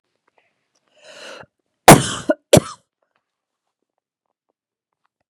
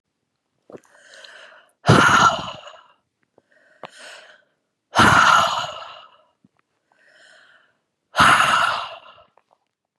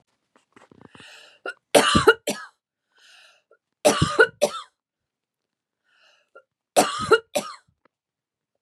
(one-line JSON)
{"cough_length": "5.3 s", "cough_amplitude": 32768, "cough_signal_mean_std_ratio": 0.18, "exhalation_length": "10.0 s", "exhalation_amplitude": 31972, "exhalation_signal_mean_std_ratio": 0.37, "three_cough_length": "8.6 s", "three_cough_amplitude": 28365, "three_cough_signal_mean_std_ratio": 0.29, "survey_phase": "beta (2021-08-13 to 2022-03-07)", "age": "18-44", "gender": "Female", "wearing_mask": "No", "symptom_none": true, "smoker_status": "Ex-smoker", "respiratory_condition_asthma": false, "respiratory_condition_other": false, "recruitment_source": "REACT", "submission_delay": "2 days", "covid_test_result": "Negative", "covid_test_method": "RT-qPCR", "influenza_a_test_result": "Negative", "influenza_b_test_result": "Negative"}